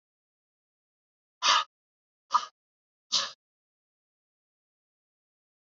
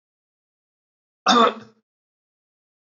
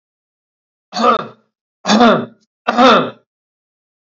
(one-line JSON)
{"exhalation_length": "5.7 s", "exhalation_amplitude": 10869, "exhalation_signal_mean_std_ratio": 0.21, "cough_length": "2.9 s", "cough_amplitude": 21230, "cough_signal_mean_std_ratio": 0.24, "three_cough_length": "4.2 s", "three_cough_amplitude": 32646, "three_cough_signal_mean_std_ratio": 0.41, "survey_phase": "alpha (2021-03-01 to 2021-08-12)", "age": "18-44", "gender": "Male", "wearing_mask": "No", "symptom_none": true, "smoker_status": "Ex-smoker", "respiratory_condition_asthma": false, "respiratory_condition_other": false, "recruitment_source": "REACT", "submission_delay": "1 day", "covid_test_result": "Negative", "covid_test_method": "RT-qPCR"}